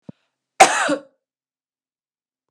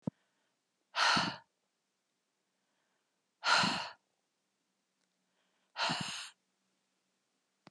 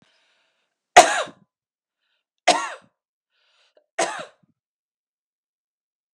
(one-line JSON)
{"cough_length": "2.5 s", "cough_amplitude": 32768, "cough_signal_mean_std_ratio": 0.25, "exhalation_length": "7.7 s", "exhalation_amplitude": 6522, "exhalation_signal_mean_std_ratio": 0.31, "three_cough_length": "6.1 s", "three_cough_amplitude": 32768, "three_cough_signal_mean_std_ratio": 0.19, "survey_phase": "beta (2021-08-13 to 2022-03-07)", "age": "45-64", "gender": "Female", "wearing_mask": "No", "symptom_cough_any": true, "symptom_runny_or_blocked_nose": true, "symptom_fatigue": true, "symptom_headache": true, "symptom_other": true, "smoker_status": "Never smoked", "respiratory_condition_asthma": false, "respiratory_condition_other": false, "recruitment_source": "Test and Trace", "submission_delay": "0 days", "covid_test_result": "Positive", "covid_test_method": "LFT"}